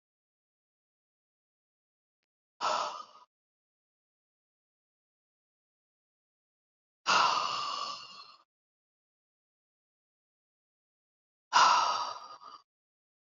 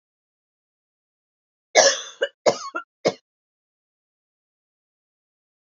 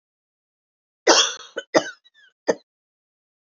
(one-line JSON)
{"exhalation_length": "13.2 s", "exhalation_amplitude": 9855, "exhalation_signal_mean_std_ratio": 0.27, "cough_length": "5.6 s", "cough_amplitude": 28093, "cough_signal_mean_std_ratio": 0.22, "three_cough_length": "3.6 s", "three_cough_amplitude": 31094, "three_cough_signal_mean_std_ratio": 0.25, "survey_phase": "beta (2021-08-13 to 2022-03-07)", "age": "45-64", "gender": "Female", "wearing_mask": "No", "symptom_none": true, "smoker_status": "Never smoked", "respiratory_condition_asthma": false, "respiratory_condition_other": false, "recruitment_source": "REACT", "submission_delay": "3 days", "covid_test_result": "Negative", "covid_test_method": "RT-qPCR", "influenza_a_test_result": "Negative", "influenza_b_test_result": "Negative"}